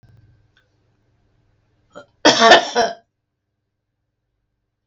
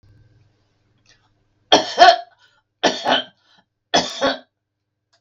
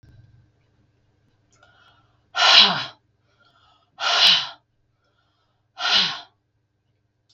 cough_length: 4.9 s
cough_amplitude: 32768
cough_signal_mean_std_ratio: 0.25
three_cough_length: 5.2 s
three_cough_amplitude: 32768
three_cough_signal_mean_std_ratio: 0.31
exhalation_length: 7.3 s
exhalation_amplitude: 32768
exhalation_signal_mean_std_ratio: 0.31
survey_phase: beta (2021-08-13 to 2022-03-07)
age: 65+
gender: Female
wearing_mask: 'No'
symptom_none: true
smoker_status: Ex-smoker
respiratory_condition_asthma: false
respiratory_condition_other: false
recruitment_source: REACT
submission_delay: 3 days
covid_test_result: Negative
covid_test_method: RT-qPCR
influenza_a_test_result: Negative
influenza_b_test_result: Negative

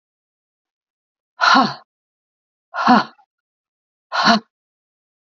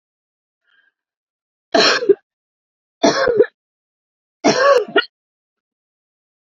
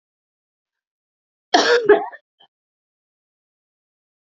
exhalation_length: 5.2 s
exhalation_amplitude: 27966
exhalation_signal_mean_std_ratio: 0.31
three_cough_length: 6.5 s
three_cough_amplitude: 31413
three_cough_signal_mean_std_ratio: 0.35
cough_length: 4.4 s
cough_amplitude: 30172
cough_signal_mean_std_ratio: 0.25
survey_phase: alpha (2021-03-01 to 2021-08-12)
age: 45-64
gender: Female
wearing_mask: 'No'
symptom_fatigue: true
symptom_headache: true
symptom_onset: 2 days
smoker_status: Ex-smoker
respiratory_condition_asthma: false
respiratory_condition_other: false
recruitment_source: Test and Trace
submission_delay: 2 days
covid_test_result: Positive
covid_test_method: RT-qPCR
covid_ct_value: 18.0
covid_ct_gene: ORF1ab gene
covid_ct_mean: 18.3
covid_viral_load: 970000 copies/ml
covid_viral_load_category: Low viral load (10K-1M copies/ml)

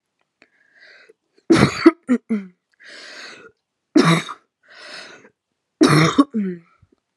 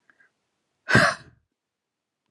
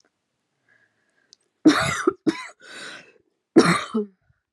three_cough_length: 7.2 s
three_cough_amplitude: 32768
three_cough_signal_mean_std_ratio: 0.35
exhalation_length: 2.3 s
exhalation_amplitude: 19696
exhalation_signal_mean_std_ratio: 0.25
cough_length: 4.5 s
cough_amplitude: 29717
cough_signal_mean_std_ratio: 0.33
survey_phase: alpha (2021-03-01 to 2021-08-12)
age: 18-44
gender: Female
wearing_mask: 'No'
symptom_none: true
smoker_status: Current smoker (1 to 10 cigarettes per day)
respiratory_condition_asthma: true
respiratory_condition_other: false
recruitment_source: REACT
submission_delay: 2 days
covid_test_result: Negative
covid_test_method: RT-qPCR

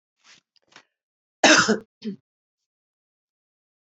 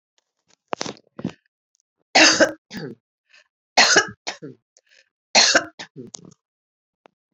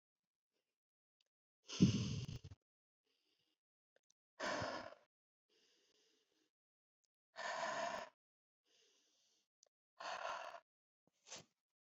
cough_length: 3.9 s
cough_amplitude: 25455
cough_signal_mean_std_ratio: 0.23
three_cough_length: 7.3 s
three_cough_amplitude: 29525
three_cough_signal_mean_std_ratio: 0.3
exhalation_length: 11.9 s
exhalation_amplitude: 3474
exhalation_signal_mean_std_ratio: 0.29
survey_phase: beta (2021-08-13 to 2022-03-07)
age: 65+
gender: Female
wearing_mask: 'No'
symptom_none: true
smoker_status: Never smoked
respiratory_condition_asthma: false
respiratory_condition_other: false
recruitment_source: REACT
submission_delay: 2 days
covid_test_result: Negative
covid_test_method: RT-qPCR
influenza_a_test_result: Negative
influenza_b_test_result: Negative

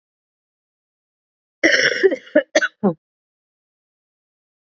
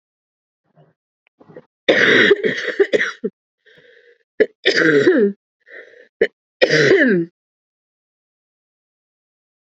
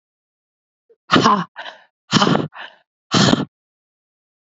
cough_length: 4.7 s
cough_amplitude: 32768
cough_signal_mean_std_ratio: 0.3
three_cough_length: 9.6 s
three_cough_amplitude: 29828
three_cough_signal_mean_std_ratio: 0.41
exhalation_length: 4.5 s
exhalation_amplitude: 29674
exhalation_signal_mean_std_ratio: 0.37
survey_phase: beta (2021-08-13 to 2022-03-07)
age: 18-44
gender: Female
wearing_mask: 'No'
symptom_cough_any: true
symptom_new_continuous_cough: true
symptom_runny_or_blocked_nose: true
symptom_sore_throat: true
symptom_fatigue: true
symptom_fever_high_temperature: true
symptom_headache: true
symptom_other: true
symptom_onset: 4 days
smoker_status: Ex-smoker
respiratory_condition_asthma: false
respiratory_condition_other: false
recruitment_source: Test and Trace
submission_delay: 2 days
covid_test_result: Positive
covid_test_method: RT-qPCR
covid_ct_value: 19.2
covid_ct_gene: N gene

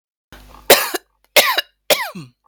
cough_length: 2.5 s
cough_amplitude: 32768
cough_signal_mean_std_ratio: 0.37
survey_phase: beta (2021-08-13 to 2022-03-07)
age: 45-64
gender: Female
wearing_mask: 'No'
symptom_sore_throat: true
symptom_onset: 2 days
smoker_status: Never smoked
respiratory_condition_asthma: false
respiratory_condition_other: false
recruitment_source: Test and Trace
submission_delay: 1 day
covid_test_result: Negative
covid_test_method: ePCR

